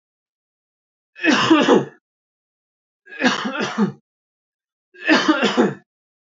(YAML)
three_cough_length: 6.2 s
three_cough_amplitude: 26094
three_cough_signal_mean_std_ratio: 0.43
survey_phase: beta (2021-08-13 to 2022-03-07)
age: 18-44
gender: Male
wearing_mask: 'No'
symptom_none: true
smoker_status: Ex-smoker
respiratory_condition_asthma: false
respiratory_condition_other: false
recruitment_source: REACT
submission_delay: 6 days
covid_test_result: Negative
covid_test_method: RT-qPCR